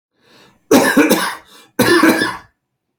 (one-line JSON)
{"cough_length": "3.0 s", "cough_amplitude": 32768, "cough_signal_mean_std_ratio": 0.53, "survey_phase": "beta (2021-08-13 to 2022-03-07)", "age": "18-44", "gender": "Male", "wearing_mask": "No", "symptom_none": true, "smoker_status": "Never smoked", "respiratory_condition_asthma": false, "respiratory_condition_other": false, "recruitment_source": "REACT", "submission_delay": "1 day", "covid_test_result": "Negative", "covid_test_method": "RT-qPCR"}